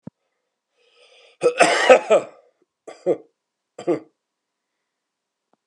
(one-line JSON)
{"cough_length": "5.7 s", "cough_amplitude": 32765, "cough_signal_mean_std_ratio": 0.29, "survey_phase": "beta (2021-08-13 to 2022-03-07)", "age": "45-64", "gender": "Male", "wearing_mask": "No", "symptom_cough_any": true, "symptom_runny_or_blocked_nose": true, "symptom_shortness_of_breath": true, "symptom_abdominal_pain": true, "symptom_fatigue": true, "symptom_fever_high_temperature": true, "symptom_headache": true, "smoker_status": "Never smoked", "respiratory_condition_asthma": false, "respiratory_condition_other": true, "recruitment_source": "Test and Trace", "submission_delay": "2 days", "covid_test_result": "Positive", "covid_test_method": "RT-qPCR", "covid_ct_value": 14.8, "covid_ct_gene": "ORF1ab gene", "covid_ct_mean": 15.1, "covid_viral_load": "11000000 copies/ml", "covid_viral_load_category": "High viral load (>1M copies/ml)"}